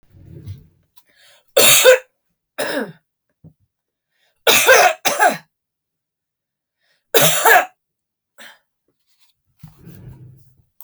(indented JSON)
{
  "three_cough_length": "10.8 s",
  "three_cough_amplitude": 32768,
  "three_cough_signal_mean_std_ratio": 0.34,
  "survey_phase": "beta (2021-08-13 to 2022-03-07)",
  "age": "45-64",
  "gender": "Female",
  "wearing_mask": "No",
  "symptom_cough_any": true,
  "symptom_onset": "11 days",
  "smoker_status": "Ex-smoker",
  "respiratory_condition_asthma": true,
  "respiratory_condition_other": false,
  "recruitment_source": "REACT",
  "submission_delay": "7 days",
  "covid_test_result": "Negative",
  "covid_test_method": "RT-qPCR"
}